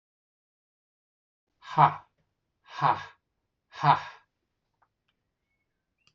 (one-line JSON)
{"exhalation_length": "6.1 s", "exhalation_amplitude": 18554, "exhalation_signal_mean_std_ratio": 0.22, "survey_phase": "alpha (2021-03-01 to 2021-08-12)", "age": "45-64", "gender": "Male", "wearing_mask": "No", "symptom_none": true, "smoker_status": "Never smoked", "respiratory_condition_asthma": false, "respiratory_condition_other": false, "recruitment_source": "REACT", "submission_delay": "2 days", "covid_test_result": "Negative", "covid_test_method": "RT-qPCR"}